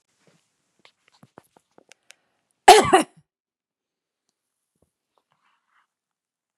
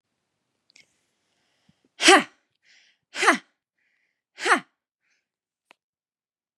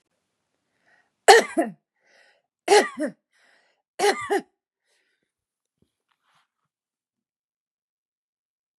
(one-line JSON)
{"cough_length": "6.6 s", "cough_amplitude": 32768, "cough_signal_mean_std_ratio": 0.15, "exhalation_length": "6.6 s", "exhalation_amplitude": 31763, "exhalation_signal_mean_std_ratio": 0.21, "three_cough_length": "8.8 s", "three_cough_amplitude": 32767, "three_cough_signal_mean_std_ratio": 0.21, "survey_phase": "beta (2021-08-13 to 2022-03-07)", "age": "45-64", "gender": "Female", "wearing_mask": "No", "symptom_none": true, "smoker_status": "Never smoked", "respiratory_condition_asthma": false, "respiratory_condition_other": false, "recruitment_source": "REACT", "submission_delay": "0 days", "covid_test_result": "Negative", "covid_test_method": "RT-qPCR", "influenza_a_test_result": "Negative", "influenza_b_test_result": "Negative"}